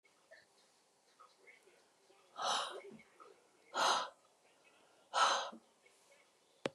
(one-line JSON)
{"exhalation_length": "6.7 s", "exhalation_amplitude": 3676, "exhalation_signal_mean_std_ratio": 0.34, "survey_phase": "beta (2021-08-13 to 2022-03-07)", "age": "65+", "gender": "Female", "wearing_mask": "No", "symptom_cough_any": true, "smoker_status": "Never smoked", "respiratory_condition_asthma": false, "respiratory_condition_other": false, "recruitment_source": "REACT", "submission_delay": "5 days", "covid_test_result": "Negative", "covid_test_method": "RT-qPCR", "influenza_a_test_result": "Negative", "influenza_b_test_result": "Negative"}